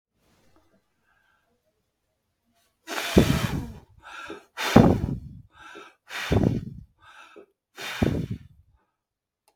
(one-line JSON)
{"exhalation_length": "9.6 s", "exhalation_amplitude": 32766, "exhalation_signal_mean_std_ratio": 0.33, "survey_phase": "beta (2021-08-13 to 2022-03-07)", "age": "65+", "gender": "Male", "wearing_mask": "No", "symptom_none": true, "smoker_status": "Never smoked", "respiratory_condition_asthma": false, "respiratory_condition_other": false, "recruitment_source": "REACT", "submission_delay": "0 days", "covid_test_result": "Negative", "covid_test_method": "RT-qPCR"}